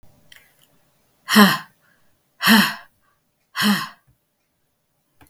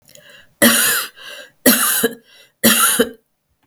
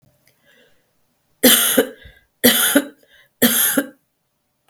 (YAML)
exhalation_length: 5.3 s
exhalation_amplitude: 32766
exhalation_signal_mean_std_ratio: 0.31
cough_length: 3.7 s
cough_amplitude: 32768
cough_signal_mean_std_ratio: 0.51
three_cough_length: 4.7 s
three_cough_amplitude: 32768
three_cough_signal_mean_std_ratio: 0.41
survey_phase: beta (2021-08-13 to 2022-03-07)
age: 65+
gender: Female
wearing_mask: 'No'
symptom_cough_any: true
symptom_onset: 2 days
smoker_status: Never smoked
respiratory_condition_asthma: false
respiratory_condition_other: false
recruitment_source: Test and Trace
submission_delay: 1 day
covid_test_result: Negative
covid_test_method: RT-qPCR